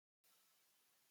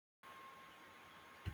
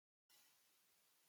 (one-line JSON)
{"three_cough_length": "1.1 s", "three_cough_amplitude": 33, "three_cough_signal_mean_std_ratio": 0.86, "exhalation_length": "1.5 s", "exhalation_amplitude": 723, "exhalation_signal_mean_std_ratio": 0.65, "cough_length": "1.3 s", "cough_amplitude": 53, "cough_signal_mean_std_ratio": 0.81, "survey_phase": "beta (2021-08-13 to 2022-03-07)", "age": "65+", "gender": "Male", "wearing_mask": "No", "symptom_runny_or_blocked_nose": true, "symptom_onset": "7 days", "smoker_status": "Ex-smoker", "respiratory_condition_asthma": false, "respiratory_condition_other": false, "recruitment_source": "REACT", "submission_delay": "1 day", "covid_test_result": "Negative", "covid_test_method": "RT-qPCR", "influenza_a_test_result": "Negative", "influenza_b_test_result": "Negative"}